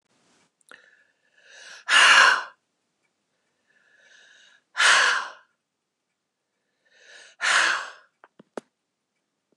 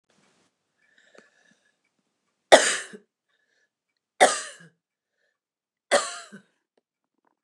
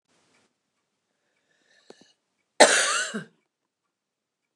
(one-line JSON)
{"exhalation_length": "9.6 s", "exhalation_amplitude": 24695, "exhalation_signal_mean_std_ratio": 0.31, "three_cough_length": "7.4 s", "three_cough_amplitude": 29203, "three_cough_signal_mean_std_ratio": 0.19, "cough_length": "4.6 s", "cough_amplitude": 29115, "cough_signal_mean_std_ratio": 0.23, "survey_phase": "beta (2021-08-13 to 2022-03-07)", "age": "45-64", "gender": "Female", "wearing_mask": "No", "symptom_none": true, "smoker_status": "Never smoked", "respiratory_condition_asthma": false, "respiratory_condition_other": false, "recruitment_source": "REACT", "submission_delay": "1 day", "covid_test_result": "Negative", "covid_test_method": "RT-qPCR", "influenza_a_test_result": "Negative", "influenza_b_test_result": "Negative"}